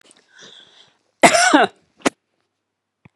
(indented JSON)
{
  "cough_length": "3.2 s",
  "cough_amplitude": 32768,
  "cough_signal_mean_std_ratio": 0.3,
  "survey_phase": "beta (2021-08-13 to 2022-03-07)",
  "age": "65+",
  "gender": "Female",
  "wearing_mask": "No",
  "symptom_none": true,
  "smoker_status": "Never smoked",
  "respiratory_condition_asthma": false,
  "respiratory_condition_other": false,
  "recruitment_source": "REACT",
  "submission_delay": "2 days",
  "covid_test_result": "Negative",
  "covid_test_method": "RT-qPCR",
  "influenza_a_test_result": "Negative",
  "influenza_b_test_result": "Negative"
}